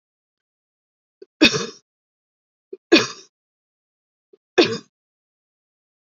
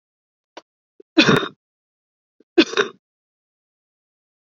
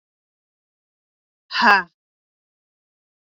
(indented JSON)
{
  "three_cough_length": "6.1 s",
  "three_cough_amplitude": 30509,
  "three_cough_signal_mean_std_ratio": 0.21,
  "cough_length": "4.5 s",
  "cough_amplitude": 27567,
  "cough_signal_mean_std_ratio": 0.23,
  "exhalation_length": "3.2 s",
  "exhalation_amplitude": 28378,
  "exhalation_signal_mean_std_ratio": 0.21,
  "survey_phase": "beta (2021-08-13 to 2022-03-07)",
  "age": "18-44",
  "gender": "Female",
  "wearing_mask": "No",
  "symptom_cough_any": true,
  "symptom_runny_or_blocked_nose": true,
  "symptom_fever_high_temperature": true,
  "symptom_change_to_sense_of_smell_or_taste": true,
  "symptom_onset": "2 days",
  "smoker_status": "Never smoked",
  "respiratory_condition_asthma": false,
  "respiratory_condition_other": false,
  "recruitment_source": "Test and Trace",
  "submission_delay": "2 days",
  "covid_test_result": "Positive",
  "covid_test_method": "RT-qPCR",
  "covid_ct_value": 22.1,
  "covid_ct_gene": "S gene"
}